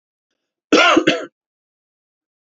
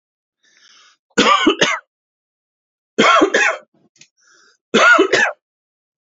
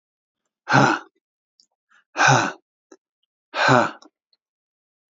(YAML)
cough_length: 2.6 s
cough_amplitude: 28739
cough_signal_mean_std_ratio: 0.33
three_cough_length: 6.1 s
three_cough_amplitude: 29884
three_cough_signal_mean_std_ratio: 0.43
exhalation_length: 5.1 s
exhalation_amplitude: 32743
exhalation_signal_mean_std_ratio: 0.33
survey_phase: beta (2021-08-13 to 2022-03-07)
age: 45-64
gender: Male
wearing_mask: 'No'
symptom_cough_any: true
symptom_runny_or_blocked_nose: true
smoker_status: Never smoked
respiratory_condition_asthma: false
respiratory_condition_other: false
recruitment_source: Test and Trace
submission_delay: -1 day
covid_test_result: Negative
covid_test_method: LFT